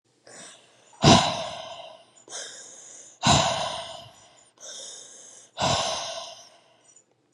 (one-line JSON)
{"exhalation_length": "7.3 s", "exhalation_amplitude": 27491, "exhalation_signal_mean_std_ratio": 0.39, "survey_phase": "beta (2021-08-13 to 2022-03-07)", "age": "18-44", "gender": "Female", "wearing_mask": "No", "symptom_cough_any": true, "symptom_runny_or_blocked_nose": true, "symptom_shortness_of_breath": true, "symptom_fatigue": true, "symptom_loss_of_taste": true, "smoker_status": "Never smoked", "respiratory_condition_asthma": true, "respiratory_condition_other": false, "recruitment_source": "Test and Trace", "submission_delay": "1 day", "covid_test_result": "Positive", "covid_test_method": "RT-qPCR", "covid_ct_value": 18.6, "covid_ct_gene": "ORF1ab gene", "covid_ct_mean": 19.1, "covid_viral_load": "550000 copies/ml", "covid_viral_load_category": "Low viral load (10K-1M copies/ml)"}